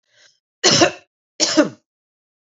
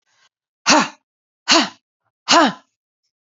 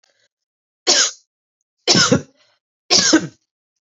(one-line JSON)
{"cough_length": "2.6 s", "cough_amplitude": 32493, "cough_signal_mean_std_ratio": 0.36, "exhalation_length": "3.3 s", "exhalation_amplitude": 32767, "exhalation_signal_mean_std_ratio": 0.34, "three_cough_length": "3.8 s", "three_cough_amplitude": 32767, "three_cough_signal_mean_std_ratio": 0.38, "survey_phase": "beta (2021-08-13 to 2022-03-07)", "age": "18-44", "gender": "Female", "wearing_mask": "No", "symptom_none": true, "smoker_status": "Current smoker (11 or more cigarettes per day)", "respiratory_condition_asthma": false, "respiratory_condition_other": false, "recruitment_source": "Test and Trace", "submission_delay": "1 day", "covid_test_result": "Negative", "covid_test_method": "RT-qPCR"}